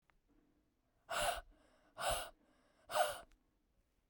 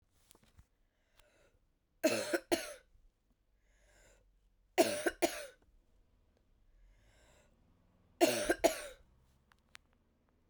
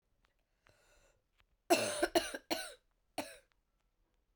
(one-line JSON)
{"exhalation_length": "4.1 s", "exhalation_amplitude": 2556, "exhalation_signal_mean_std_ratio": 0.37, "three_cough_length": "10.5 s", "three_cough_amplitude": 6925, "three_cough_signal_mean_std_ratio": 0.27, "cough_length": "4.4 s", "cough_amplitude": 6775, "cough_signal_mean_std_ratio": 0.29, "survey_phase": "beta (2021-08-13 to 2022-03-07)", "age": "18-44", "gender": "Female", "wearing_mask": "No", "symptom_cough_any": true, "symptom_runny_or_blocked_nose": true, "symptom_sore_throat": true, "symptom_fever_high_temperature": true, "symptom_headache": true, "symptom_change_to_sense_of_smell_or_taste": true, "symptom_onset": "3 days", "smoker_status": "Never smoked", "respiratory_condition_asthma": false, "respiratory_condition_other": false, "recruitment_source": "Test and Trace", "submission_delay": "2 days", "covid_test_result": "Positive", "covid_test_method": "RT-qPCR", "covid_ct_value": 18.7, "covid_ct_gene": "N gene"}